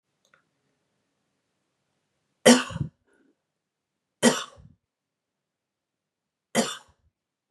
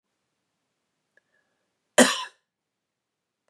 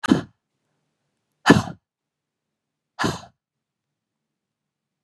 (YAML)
three_cough_length: 7.5 s
three_cough_amplitude: 26566
three_cough_signal_mean_std_ratio: 0.19
cough_length: 3.5 s
cough_amplitude: 27719
cough_signal_mean_std_ratio: 0.17
exhalation_length: 5.0 s
exhalation_amplitude: 32343
exhalation_signal_mean_std_ratio: 0.2
survey_phase: beta (2021-08-13 to 2022-03-07)
age: 18-44
gender: Female
wearing_mask: 'No'
symptom_sore_throat: true
smoker_status: Never smoked
respiratory_condition_asthma: false
respiratory_condition_other: false
recruitment_source: Test and Trace
submission_delay: 7 days
covid_test_result: Negative
covid_test_method: RT-qPCR